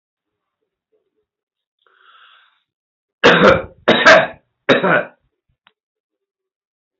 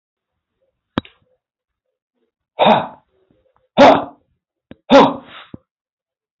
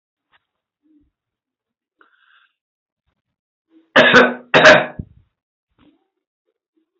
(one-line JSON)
{"three_cough_length": "7.0 s", "three_cough_amplitude": 29538, "three_cough_signal_mean_std_ratio": 0.31, "exhalation_length": "6.4 s", "exhalation_amplitude": 28720, "exhalation_signal_mean_std_ratio": 0.27, "cough_length": "7.0 s", "cough_amplitude": 29785, "cough_signal_mean_std_ratio": 0.25, "survey_phase": "beta (2021-08-13 to 2022-03-07)", "age": "65+", "gender": "Male", "wearing_mask": "No", "symptom_none": true, "smoker_status": "Never smoked", "respiratory_condition_asthma": false, "respiratory_condition_other": false, "recruitment_source": "REACT", "submission_delay": "1 day", "covid_test_result": "Negative", "covid_test_method": "RT-qPCR"}